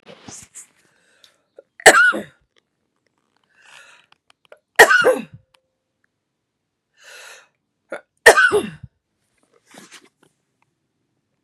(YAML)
three_cough_length: 11.4 s
three_cough_amplitude: 32768
three_cough_signal_mean_std_ratio: 0.24
survey_phase: beta (2021-08-13 to 2022-03-07)
age: 45-64
gender: Female
wearing_mask: 'No'
symptom_cough_any: true
symptom_fatigue: true
symptom_onset: 7 days
smoker_status: Never smoked
respiratory_condition_asthma: false
respiratory_condition_other: false
recruitment_source: REACT
submission_delay: 2 days
covid_test_result: Positive
covid_test_method: RT-qPCR
covid_ct_value: 27.0
covid_ct_gene: E gene
influenza_a_test_result: Negative
influenza_b_test_result: Negative